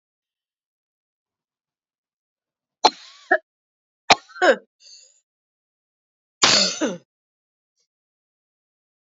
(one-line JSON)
{"cough_length": "9.0 s", "cough_amplitude": 31091, "cough_signal_mean_std_ratio": 0.22, "survey_phase": "beta (2021-08-13 to 2022-03-07)", "age": "45-64", "gender": "Female", "wearing_mask": "No", "symptom_cough_any": true, "symptom_diarrhoea": true, "symptom_fatigue": true, "smoker_status": "Never smoked", "respiratory_condition_asthma": false, "respiratory_condition_other": false, "recruitment_source": "Test and Trace", "submission_delay": "2 days", "covid_test_result": "Positive", "covid_test_method": "RT-qPCR", "covid_ct_value": 19.8, "covid_ct_gene": "ORF1ab gene", "covid_ct_mean": 20.4, "covid_viral_load": "200000 copies/ml", "covid_viral_load_category": "Low viral load (10K-1M copies/ml)"}